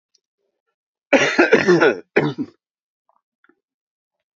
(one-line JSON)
{"cough_length": "4.4 s", "cough_amplitude": 27477, "cough_signal_mean_std_ratio": 0.37, "survey_phase": "beta (2021-08-13 to 2022-03-07)", "age": "65+", "gender": "Male", "wearing_mask": "No", "symptom_cough_any": true, "symptom_runny_or_blocked_nose": true, "symptom_onset": "5 days", "smoker_status": "Never smoked", "respiratory_condition_asthma": false, "respiratory_condition_other": false, "recruitment_source": "Test and Trace", "submission_delay": "1 day", "covid_test_result": "Positive", "covid_test_method": "RT-qPCR", "covid_ct_value": 14.6, "covid_ct_gene": "ORF1ab gene", "covid_ct_mean": 15.7, "covid_viral_load": "7000000 copies/ml", "covid_viral_load_category": "High viral load (>1M copies/ml)"}